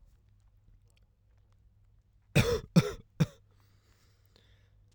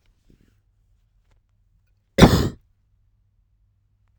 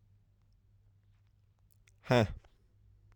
{
  "three_cough_length": "4.9 s",
  "three_cough_amplitude": 10077,
  "three_cough_signal_mean_std_ratio": 0.24,
  "cough_length": "4.2 s",
  "cough_amplitude": 32768,
  "cough_signal_mean_std_ratio": 0.19,
  "exhalation_length": "3.2 s",
  "exhalation_amplitude": 6087,
  "exhalation_signal_mean_std_ratio": 0.22,
  "survey_phase": "alpha (2021-03-01 to 2021-08-12)",
  "age": "18-44",
  "gender": "Male",
  "wearing_mask": "No",
  "symptom_fatigue": true,
  "symptom_headache": true,
  "smoker_status": "Never smoked",
  "respiratory_condition_asthma": false,
  "respiratory_condition_other": false,
  "recruitment_source": "Test and Trace",
  "submission_delay": "2 days",
  "covid_test_result": "Positive",
  "covid_test_method": "RT-qPCR"
}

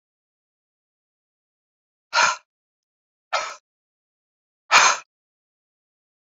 {
  "exhalation_length": "6.2 s",
  "exhalation_amplitude": 29857,
  "exhalation_signal_mean_std_ratio": 0.23,
  "survey_phase": "beta (2021-08-13 to 2022-03-07)",
  "age": "45-64",
  "gender": "Female",
  "wearing_mask": "No",
  "symptom_cough_any": true,
  "symptom_runny_or_blocked_nose": true,
  "symptom_sore_throat": true,
  "symptom_headache": true,
  "symptom_change_to_sense_of_smell_or_taste": true,
  "symptom_onset": "5 days",
  "smoker_status": "Never smoked",
  "respiratory_condition_asthma": false,
  "respiratory_condition_other": false,
  "recruitment_source": "Test and Trace",
  "submission_delay": "2 days",
  "covid_test_result": "Positive",
  "covid_test_method": "RT-qPCR",
  "covid_ct_value": 15.8,
  "covid_ct_gene": "ORF1ab gene",
  "covid_ct_mean": 16.4,
  "covid_viral_load": "4200000 copies/ml",
  "covid_viral_load_category": "High viral load (>1M copies/ml)"
}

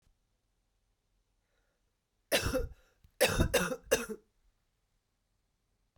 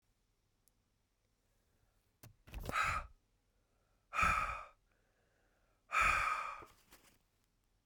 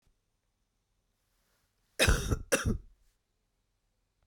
{
  "three_cough_length": "6.0 s",
  "three_cough_amplitude": 7334,
  "three_cough_signal_mean_std_ratio": 0.31,
  "exhalation_length": "7.9 s",
  "exhalation_amplitude": 3275,
  "exhalation_signal_mean_std_ratio": 0.36,
  "cough_length": "4.3 s",
  "cough_amplitude": 7896,
  "cough_signal_mean_std_ratio": 0.29,
  "survey_phase": "beta (2021-08-13 to 2022-03-07)",
  "age": "45-64",
  "gender": "Female",
  "wearing_mask": "No",
  "symptom_cough_any": true,
  "symptom_new_continuous_cough": true,
  "symptom_runny_or_blocked_nose": true,
  "symptom_fatigue": true,
  "symptom_headache": true,
  "symptom_onset": "3 days",
  "smoker_status": "Never smoked",
  "respiratory_condition_asthma": false,
  "respiratory_condition_other": false,
  "recruitment_source": "Test and Trace",
  "submission_delay": "1 day",
  "covid_test_result": "Positive",
  "covid_test_method": "RT-qPCR",
  "covid_ct_value": 27.0,
  "covid_ct_gene": "ORF1ab gene"
}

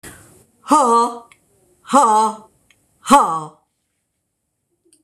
{
  "exhalation_length": "5.0 s",
  "exhalation_amplitude": 26028,
  "exhalation_signal_mean_std_ratio": 0.41,
  "survey_phase": "beta (2021-08-13 to 2022-03-07)",
  "age": "65+",
  "gender": "Female",
  "wearing_mask": "No",
  "symptom_none": true,
  "smoker_status": "Ex-smoker",
  "respiratory_condition_asthma": false,
  "respiratory_condition_other": false,
  "recruitment_source": "REACT",
  "submission_delay": "2 days",
  "covid_test_result": "Negative",
  "covid_test_method": "RT-qPCR"
}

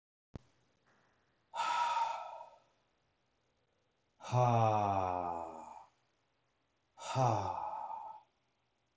{
  "exhalation_length": "9.0 s",
  "exhalation_amplitude": 4737,
  "exhalation_signal_mean_std_ratio": 0.46,
  "survey_phase": "beta (2021-08-13 to 2022-03-07)",
  "age": "45-64",
  "gender": "Male",
  "wearing_mask": "No",
  "symptom_cough_any": true,
  "symptom_runny_or_blocked_nose": true,
  "symptom_sore_throat": true,
  "symptom_diarrhoea": true,
  "symptom_fatigue": true,
  "symptom_headache": true,
  "symptom_onset": "4 days",
  "smoker_status": "Ex-smoker",
  "respiratory_condition_asthma": false,
  "respiratory_condition_other": false,
  "recruitment_source": "Test and Trace",
  "submission_delay": "1 day",
  "covid_test_result": "Positive",
  "covid_test_method": "RT-qPCR",
  "covid_ct_value": 12.6,
  "covid_ct_gene": "ORF1ab gene"
}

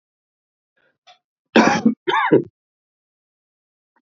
{
  "cough_length": "4.0 s",
  "cough_amplitude": 29327,
  "cough_signal_mean_std_ratio": 0.31,
  "survey_phase": "beta (2021-08-13 to 2022-03-07)",
  "age": "65+",
  "gender": "Male",
  "wearing_mask": "No",
  "symptom_cough_any": true,
  "symptom_fatigue": true,
  "symptom_fever_high_temperature": true,
  "symptom_headache": true,
  "symptom_other": true,
  "smoker_status": "Ex-smoker",
  "respiratory_condition_asthma": false,
  "respiratory_condition_other": false,
  "recruitment_source": "Test and Trace",
  "submission_delay": "2 days",
  "covid_test_result": "Positive",
  "covid_test_method": "RT-qPCR",
  "covid_ct_value": 22.8,
  "covid_ct_gene": "ORF1ab gene",
  "covid_ct_mean": 23.6,
  "covid_viral_load": "18000 copies/ml",
  "covid_viral_load_category": "Low viral load (10K-1M copies/ml)"
}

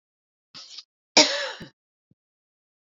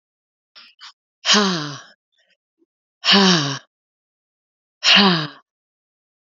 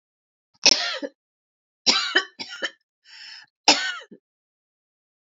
{
  "cough_length": "2.9 s",
  "cough_amplitude": 26873,
  "cough_signal_mean_std_ratio": 0.23,
  "exhalation_length": "6.2 s",
  "exhalation_amplitude": 31556,
  "exhalation_signal_mean_std_ratio": 0.36,
  "three_cough_length": "5.3 s",
  "three_cough_amplitude": 28851,
  "three_cough_signal_mean_std_ratio": 0.31,
  "survey_phase": "beta (2021-08-13 to 2022-03-07)",
  "age": "45-64",
  "gender": "Female",
  "wearing_mask": "Yes",
  "symptom_cough_any": true,
  "symptom_runny_or_blocked_nose": true,
  "symptom_abdominal_pain": true,
  "symptom_headache": true,
  "symptom_change_to_sense_of_smell_or_taste": true,
  "smoker_status": "Ex-smoker",
  "respiratory_condition_asthma": false,
  "respiratory_condition_other": false,
  "recruitment_source": "Test and Trace",
  "submission_delay": "2 days",
  "covid_test_result": "Positive",
  "covid_test_method": "RT-qPCR",
  "covid_ct_value": 24.0,
  "covid_ct_gene": "ORF1ab gene",
  "covid_ct_mean": 24.2,
  "covid_viral_load": "11000 copies/ml",
  "covid_viral_load_category": "Low viral load (10K-1M copies/ml)"
}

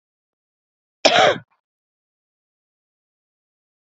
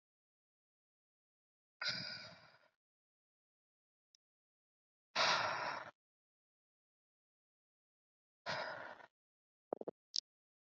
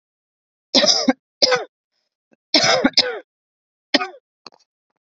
{
  "cough_length": "3.8 s",
  "cough_amplitude": 30076,
  "cough_signal_mean_std_ratio": 0.22,
  "exhalation_length": "10.7 s",
  "exhalation_amplitude": 4392,
  "exhalation_signal_mean_std_ratio": 0.27,
  "three_cough_length": "5.1 s",
  "three_cough_amplitude": 31584,
  "three_cough_signal_mean_std_ratio": 0.36,
  "survey_phase": "beta (2021-08-13 to 2022-03-07)",
  "age": "18-44",
  "gender": "Female",
  "wearing_mask": "No",
  "symptom_cough_any": true,
  "symptom_shortness_of_breath": true,
  "smoker_status": "Current smoker (1 to 10 cigarettes per day)",
  "respiratory_condition_asthma": false,
  "respiratory_condition_other": false,
  "recruitment_source": "Test and Trace",
  "submission_delay": "13 days",
  "covid_test_result": "Negative",
  "covid_test_method": "RT-qPCR"
}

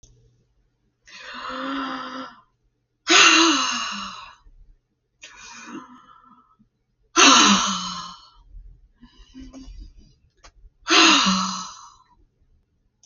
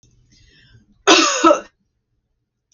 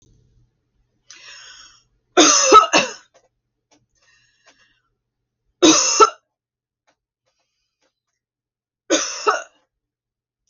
{
  "exhalation_length": "13.1 s",
  "exhalation_amplitude": 31962,
  "exhalation_signal_mean_std_ratio": 0.37,
  "cough_length": "2.7 s",
  "cough_amplitude": 32767,
  "cough_signal_mean_std_ratio": 0.33,
  "three_cough_length": "10.5 s",
  "three_cough_amplitude": 32025,
  "three_cough_signal_mean_std_ratio": 0.28,
  "survey_phase": "beta (2021-08-13 to 2022-03-07)",
  "age": "45-64",
  "gender": "Female",
  "wearing_mask": "No",
  "symptom_none": true,
  "smoker_status": "Never smoked",
  "respiratory_condition_asthma": false,
  "respiratory_condition_other": false,
  "recruitment_source": "REACT",
  "submission_delay": "1 day",
  "covid_test_result": "Negative",
  "covid_test_method": "RT-qPCR"
}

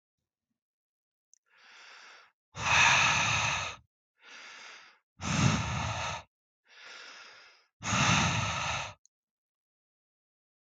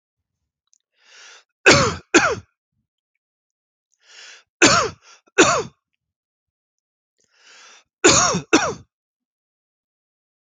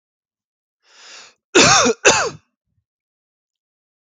{
  "exhalation_length": "10.7 s",
  "exhalation_amplitude": 8471,
  "exhalation_signal_mean_std_ratio": 0.45,
  "three_cough_length": "10.5 s",
  "three_cough_amplitude": 32431,
  "three_cough_signal_mean_std_ratio": 0.3,
  "cough_length": "4.2 s",
  "cough_amplitude": 32768,
  "cough_signal_mean_std_ratio": 0.31,
  "survey_phase": "alpha (2021-03-01 to 2021-08-12)",
  "age": "18-44",
  "gender": "Male",
  "wearing_mask": "No",
  "symptom_none": true,
  "symptom_onset": "10 days",
  "smoker_status": "Ex-smoker",
  "respiratory_condition_asthma": false,
  "respiratory_condition_other": false,
  "recruitment_source": "REACT",
  "submission_delay": "1 day",
  "covid_test_result": "Negative",
  "covid_test_method": "RT-qPCR"
}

